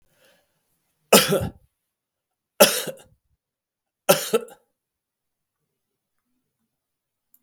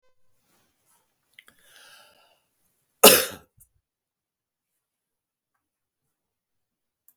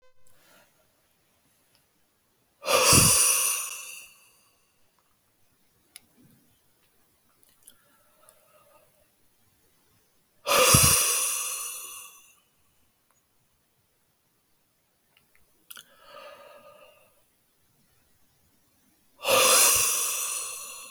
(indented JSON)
{
  "three_cough_length": "7.4 s",
  "three_cough_amplitude": 32768,
  "three_cough_signal_mean_std_ratio": 0.22,
  "cough_length": "7.2 s",
  "cough_amplitude": 32768,
  "cough_signal_mean_std_ratio": 0.13,
  "exhalation_length": "20.9 s",
  "exhalation_amplitude": 30628,
  "exhalation_signal_mean_std_ratio": 0.33,
  "survey_phase": "beta (2021-08-13 to 2022-03-07)",
  "age": "65+",
  "gender": "Male",
  "wearing_mask": "No",
  "symptom_none": true,
  "smoker_status": "Ex-smoker",
  "respiratory_condition_asthma": false,
  "respiratory_condition_other": false,
  "recruitment_source": "REACT",
  "submission_delay": "1 day",
  "covid_test_result": "Negative",
  "covid_test_method": "RT-qPCR",
  "influenza_a_test_result": "Negative",
  "influenza_b_test_result": "Negative"
}